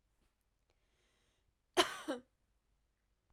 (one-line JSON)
{"cough_length": "3.3 s", "cough_amplitude": 5821, "cough_signal_mean_std_ratio": 0.19, "survey_phase": "alpha (2021-03-01 to 2021-08-12)", "age": "18-44", "gender": "Female", "wearing_mask": "No", "symptom_cough_any": true, "symptom_fatigue": true, "symptom_fever_high_temperature": true, "symptom_headache": true, "smoker_status": "Never smoked", "respiratory_condition_asthma": false, "respiratory_condition_other": false, "recruitment_source": "Test and Trace", "submission_delay": "2 days", "covid_test_result": "Positive", "covid_test_method": "LFT"}